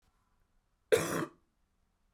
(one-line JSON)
{"cough_length": "2.1 s", "cough_amplitude": 7112, "cough_signal_mean_std_ratio": 0.27, "survey_phase": "beta (2021-08-13 to 2022-03-07)", "age": "18-44", "gender": "Female", "wearing_mask": "No", "symptom_cough_any": true, "symptom_shortness_of_breath": true, "symptom_diarrhoea": true, "symptom_fatigue": true, "symptom_onset": "4 days", "smoker_status": "Never smoked", "respiratory_condition_asthma": false, "respiratory_condition_other": false, "recruitment_source": "Test and Trace", "submission_delay": "1 day", "covid_test_result": "Positive", "covid_test_method": "RT-qPCR", "covid_ct_value": 29.0, "covid_ct_gene": "N gene"}